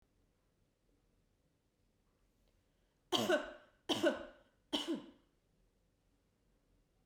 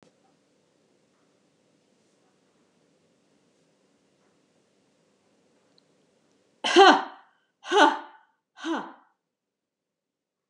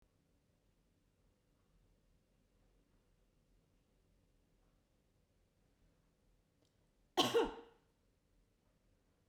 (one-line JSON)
{"three_cough_length": "7.1 s", "three_cough_amplitude": 3833, "three_cough_signal_mean_std_ratio": 0.28, "exhalation_length": "10.5 s", "exhalation_amplitude": 25217, "exhalation_signal_mean_std_ratio": 0.2, "cough_length": "9.3 s", "cough_amplitude": 3426, "cough_signal_mean_std_ratio": 0.18, "survey_phase": "beta (2021-08-13 to 2022-03-07)", "age": "45-64", "gender": "Female", "wearing_mask": "No", "symptom_none": true, "smoker_status": "Never smoked", "respiratory_condition_asthma": false, "respiratory_condition_other": false, "recruitment_source": "REACT", "submission_delay": "1 day", "covid_test_result": "Negative", "covid_test_method": "RT-qPCR", "influenza_a_test_result": "Unknown/Void", "influenza_b_test_result": "Unknown/Void"}